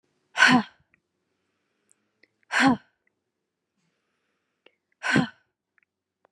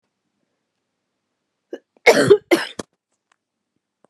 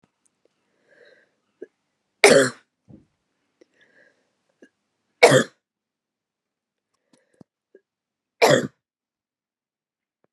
{"exhalation_length": "6.3 s", "exhalation_amplitude": 20822, "exhalation_signal_mean_std_ratio": 0.25, "cough_length": "4.1 s", "cough_amplitude": 32767, "cough_signal_mean_std_ratio": 0.24, "three_cough_length": "10.3 s", "three_cough_amplitude": 32768, "three_cough_signal_mean_std_ratio": 0.2, "survey_phase": "beta (2021-08-13 to 2022-03-07)", "age": "45-64", "gender": "Female", "wearing_mask": "No", "symptom_cough_any": true, "symptom_runny_or_blocked_nose": true, "symptom_fatigue": true, "symptom_fever_high_temperature": true, "symptom_headache": true, "symptom_other": true, "symptom_onset": "2 days", "smoker_status": "Ex-smoker", "respiratory_condition_asthma": false, "respiratory_condition_other": false, "recruitment_source": "Test and Trace", "submission_delay": "2 days", "covid_test_result": "Positive", "covid_test_method": "RT-qPCR", "covid_ct_value": 33.8, "covid_ct_gene": "ORF1ab gene"}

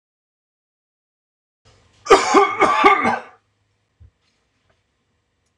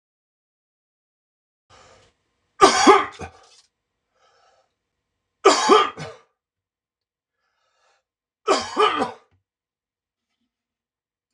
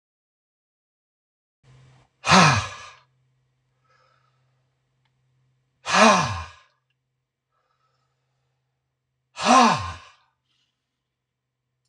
{"cough_length": "5.6 s", "cough_amplitude": 26028, "cough_signal_mean_std_ratio": 0.32, "three_cough_length": "11.3 s", "three_cough_amplitude": 26028, "three_cough_signal_mean_std_ratio": 0.26, "exhalation_length": "11.9 s", "exhalation_amplitude": 26019, "exhalation_signal_mean_std_ratio": 0.26, "survey_phase": "beta (2021-08-13 to 2022-03-07)", "age": "45-64", "gender": "Male", "wearing_mask": "No", "symptom_none": true, "smoker_status": "Never smoked", "respiratory_condition_asthma": false, "respiratory_condition_other": false, "recruitment_source": "REACT", "submission_delay": "0 days", "covid_test_result": "Negative", "covid_test_method": "RT-qPCR", "influenza_a_test_result": "Negative", "influenza_b_test_result": "Negative"}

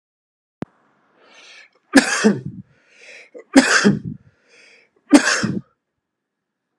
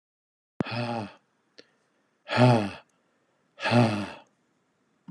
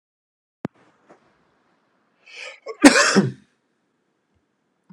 {"three_cough_length": "6.8 s", "three_cough_amplitude": 32768, "three_cough_signal_mean_std_ratio": 0.32, "exhalation_length": "5.1 s", "exhalation_amplitude": 14448, "exhalation_signal_mean_std_ratio": 0.37, "cough_length": "4.9 s", "cough_amplitude": 32768, "cough_signal_mean_std_ratio": 0.23, "survey_phase": "alpha (2021-03-01 to 2021-08-12)", "age": "45-64", "gender": "Male", "wearing_mask": "No", "symptom_headache": true, "symptom_onset": "12 days", "smoker_status": "Ex-smoker", "respiratory_condition_asthma": false, "respiratory_condition_other": false, "recruitment_source": "REACT", "submission_delay": "1 day", "covid_test_result": "Negative", "covid_test_method": "RT-qPCR"}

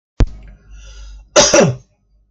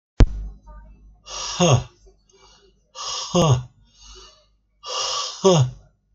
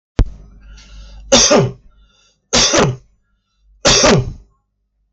{"cough_length": "2.3 s", "cough_amplitude": 32768, "cough_signal_mean_std_ratio": 0.41, "exhalation_length": "6.1 s", "exhalation_amplitude": 32768, "exhalation_signal_mean_std_ratio": 0.4, "three_cough_length": "5.1 s", "three_cough_amplitude": 32768, "three_cough_signal_mean_std_ratio": 0.46, "survey_phase": "beta (2021-08-13 to 2022-03-07)", "age": "45-64", "gender": "Male", "wearing_mask": "No", "symptom_fatigue": true, "symptom_onset": "12 days", "smoker_status": "Ex-smoker", "respiratory_condition_asthma": false, "respiratory_condition_other": false, "recruitment_source": "REACT", "submission_delay": "3 days", "covid_test_result": "Negative", "covid_test_method": "RT-qPCR"}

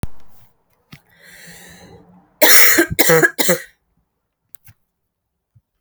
{"three_cough_length": "5.8 s", "three_cough_amplitude": 32768, "three_cough_signal_mean_std_ratio": 0.35, "survey_phase": "alpha (2021-03-01 to 2021-08-12)", "age": "18-44", "gender": "Female", "wearing_mask": "No", "symptom_cough_any": true, "symptom_shortness_of_breath": true, "symptom_fatigue": true, "symptom_headache": true, "smoker_status": "Ex-smoker", "respiratory_condition_asthma": false, "respiratory_condition_other": false, "recruitment_source": "Test and Trace", "submission_delay": "2 days", "covid_test_result": "Positive", "covid_test_method": "RT-qPCR", "covid_ct_value": 21.2, "covid_ct_gene": "ORF1ab gene", "covid_ct_mean": 21.6, "covid_viral_load": "83000 copies/ml", "covid_viral_load_category": "Low viral load (10K-1M copies/ml)"}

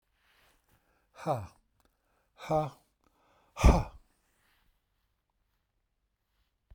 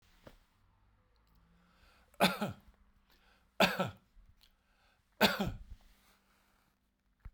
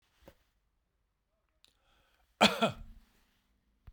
{"exhalation_length": "6.7 s", "exhalation_amplitude": 15848, "exhalation_signal_mean_std_ratio": 0.21, "three_cough_length": "7.3 s", "three_cough_amplitude": 8271, "three_cough_signal_mean_std_ratio": 0.26, "cough_length": "3.9 s", "cough_amplitude": 13053, "cough_signal_mean_std_ratio": 0.2, "survey_phase": "beta (2021-08-13 to 2022-03-07)", "age": "65+", "gender": "Male", "wearing_mask": "No", "symptom_none": true, "smoker_status": "Ex-smoker", "respiratory_condition_asthma": false, "respiratory_condition_other": false, "recruitment_source": "REACT", "submission_delay": "1 day", "covid_test_result": "Negative", "covid_test_method": "RT-qPCR"}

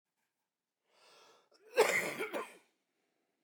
{"cough_length": "3.4 s", "cough_amplitude": 6289, "cough_signal_mean_std_ratio": 0.31, "survey_phase": "beta (2021-08-13 to 2022-03-07)", "age": "65+", "gender": "Male", "wearing_mask": "No", "symptom_none": true, "smoker_status": "Ex-smoker", "respiratory_condition_asthma": true, "respiratory_condition_other": false, "recruitment_source": "REACT", "submission_delay": "1 day", "covid_test_result": "Negative", "covid_test_method": "RT-qPCR"}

